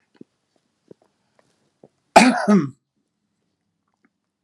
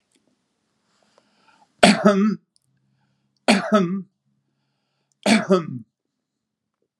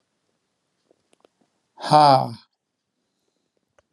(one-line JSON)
{"cough_length": "4.4 s", "cough_amplitude": 32768, "cough_signal_mean_std_ratio": 0.24, "three_cough_length": "7.0 s", "three_cough_amplitude": 32767, "three_cough_signal_mean_std_ratio": 0.33, "exhalation_length": "3.9 s", "exhalation_amplitude": 26242, "exhalation_signal_mean_std_ratio": 0.24, "survey_phase": "beta (2021-08-13 to 2022-03-07)", "age": "65+", "gender": "Male", "wearing_mask": "No", "symptom_none": true, "smoker_status": "Never smoked", "respiratory_condition_asthma": false, "respiratory_condition_other": false, "recruitment_source": "REACT", "submission_delay": "1 day", "covid_test_result": "Negative", "covid_test_method": "RT-qPCR"}